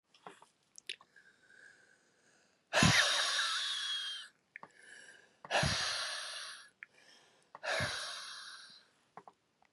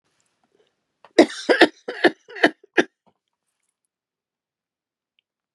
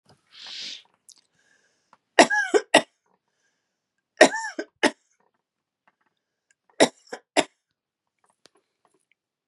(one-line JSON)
{"exhalation_length": "9.7 s", "exhalation_amplitude": 7405, "exhalation_signal_mean_std_ratio": 0.45, "cough_length": "5.5 s", "cough_amplitude": 32766, "cough_signal_mean_std_ratio": 0.22, "three_cough_length": "9.5 s", "three_cough_amplitude": 32049, "three_cough_signal_mean_std_ratio": 0.21, "survey_phase": "beta (2021-08-13 to 2022-03-07)", "age": "45-64", "gender": "Female", "wearing_mask": "No", "symptom_none": true, "symptom_onset": "9 days", "smoker_status": "Ex-smoker", "respiratory_condition_asthma": true, "respiratory_condition_other": false, "recruitment_source": "REACT", "submission_delay": "1 day", "covid_test_result": "Negative", "covid_test_method": "RT-qPCR", "influenza_a_test_result": "Negative", "influenza_b_test_result": "Negative"}